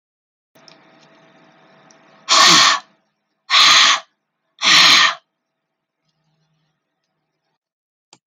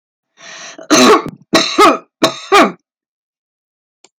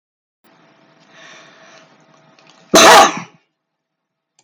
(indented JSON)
{
  "exhalation_length": "8.3 s",
  "exhalation_amplitude": 32768,
  "exhalation_signal_mean_std_ratio": 0.35,
  "three_cough_length": "4.2 s",
  "three_cough_amplitude": 32768,
  "three_cough_signal_mean_std_ratio": 0.43,
  "cough_length": "4.4 s",
  "cough_amplitude": 32768,
  "cough_signal_mean_std_ratio": 0.27,
  "survey_phase": "beta (2021-08-13 to 2022-03-07)",
  "age": "65+",
  "gender": "Female",
  "wearing_mask": "No",
  "symptom_cough_any": true,
  "symptom_shortness_of_breath": true,
  "smoker_status": "Ex-smoker",
  "respiratory_condition_asthma": false,
  "respiratory_condition_other": true,
  "recruitment_source": "REACT",
  "submission_delay": "2 days",
  "covid_test_result": "Negative",
  "covid_test_method": "RT-qPCR"
}